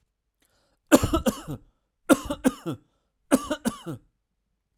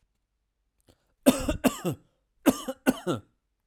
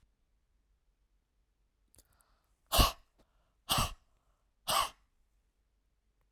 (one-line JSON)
{"three_cough_length": "4.8 s", "three_cough_amplitude": 30774, "three_cough_signal_mean_std_ratio": 0.3, "cough_length": "3.7 s", "cough_amplitude": 19377, "cough_signal_mean_std_ratio": 0.32, "exhalation_length": "6.3 s", "exhalation_amplitude": 10374, "exhalation_signal_mean_std_ratio": 0.24, "survey_phase": "alpha (2021-03-01 to 2021-08-12)", "age": "45-64", "gender": "Male", "wearing_mask": "No", "symptom_none": true, "smoker_status": "Never smoked", "respiratory_condition_asthma": false, "respiratory_condition_other": false, "recruitment_source": "REACT", "submission_delay": "2 days", "covid_test_result": "Negative", "covid_test_method": "RT-qPCR"}